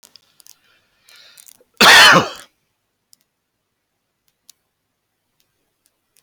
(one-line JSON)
{"cough_length": "6.2 s", "cough_amplitude": 31924, "cough_signal_mean_std_ratio": 0.24, "survey_phase": "beta (2021-08-13 to 2022-03-07)", "age": "45-64", "gender": "Male", "wearing_mask": "No", "symptom_none": true, "smoker_status": "Ex-smoker", "respiratory_condition_asthma": false, "respiratory_condition_other": false, "recruitment_source": "REACT", "submission_delay": "1 day", "covid_test_result": "Negative", "covid_test_method": "RT-qPCR"}